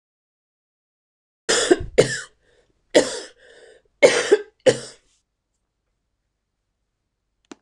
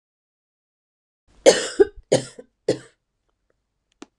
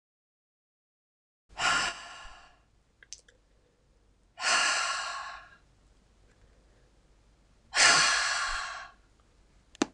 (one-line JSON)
{"three_cough_length": "7.6 s", "three_cough_amplitude": 26028, "three_cough_signal_mean_std_ratio": 0.27, "cough_length": "4.2 s", "cough_amplitude": 26028, "cough_signal_mean_std_ratio": 0.23, "exhalation_length": "9.9 s", "exhalation_amplitude": 17927, "exhalation_signal_mean_std_ratio": 0.38, "survey_phase": "beta (2021-08-13 to 2022-03-07)", "age": "45-64", "gender": "Female", "wearing_mask": "No", "symptom_cough_any": true, "symptom_runny_or_blocked_nose": true, "symptom_onset": "8 days", "smoker_status": "Never smoked", "respiratory_condition_asthma": false, "respiratory_condition_other": false, "recruitment_source": "REACT", "submission_delay": "1 day", "covid_test_result": "Negative", "covid_test_method": "RT-qPCR", "influenza_a_test_result": "Negative", "influenza_b_test_result": "Negative"}